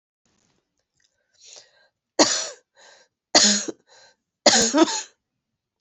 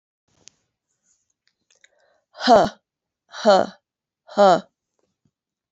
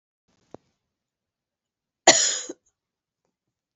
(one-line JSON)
{"three_cough_length": "5.8 s", "three_cough_amplitude": 31657, "three_cough_signal_mean_std_ratio": 0.32, "exhalation_length": "5.7 s", "exhalation_amplitude": 28662, "exhalation_signal_mean_std_ratio": 0.28, "cough_length": "3.8 s", "cough_amplitude": 29541, "cough_signal_mean_std_ratio": 0.2, "survey_phase": "beta (2021-08-13 to 2022-03-07)", "age": "45-64", "gender": "Female", "wearing_mask": "No", "symptom_cough_any": true, "symptom_runny_or_blocked_nose": true, "symptom_sore_throat": true, "symptom_fatigue": true, "symptom_headache": true, "smoker_status": "Never smoked", "respiratory_condition_asthma": false, "respiratory_condition_other": false, "recruitment_source": "Test and Trace", "submission_delay": "1 day", "covid_test_result": "Positive", "covid_test_method": "RT-qPCR"}